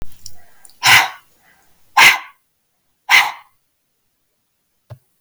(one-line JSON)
{"exhalation_length": "5.2 s", "exhalation_amplitude": 32768, "exhalation_signal_mean_std_ratio": 0.32, "survey_phase": "beta (2021-08-13 to 2022-03-07)", "age": "45-64", "gender": "Female", "wearing_mask": "No", "symptom_none": true, "smoker_status": "Never smoked", "respiratory_condition_asthma": false, "respiratory_condition_other": false, "recruitment_source": "REACT", "submission_delay": "2 days", "covid_test_result": "Negative", "covid_test_method": "RT-qPCR", "influenza_a_test_result": "Negative", "influenza_b_test_result": "Negative"}